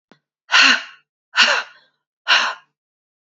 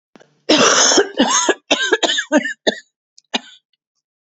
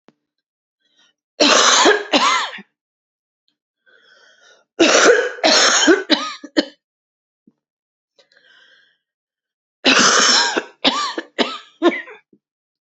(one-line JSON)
{"exhalation_length": "3.3 s", "exhalation_amplitude": 30494, "exhalation_signal_mean_std_ratio": 0.39, "cough_length": "4.3 s", "cough_amplitude": 31052, "cough_signal_mean_std_ratio": 0.52, "three_cough_length": "13.0 s", "three_cough_amplitude": 32767, "three_cough_signal_mean_std_ratio": 0.44, "survey_phase": "beta (2021-08-13 to 2022-03-07)", "age": "18-44", "gender": "Female", "wearing_mask": "No", "symptom_cough_any": true, "symptom_runny_or_blocked_nose": true, "symptom_sore_throat": true, "symptom_headache": true, "symptom_other": true, "symptom_onset": "4 days", "smoker_status": "Never smoked", "respiratory_condition_asthma": false, "respiratory_condition_other": false, "recruitment_source": "Test and Trace", "submission_delay": "1 day", "covid_test_result": "Positive", "covid_test_method": "RT-qPCR", "covid_ct_value": 24.5, "covid_ct_gene": "N gene"}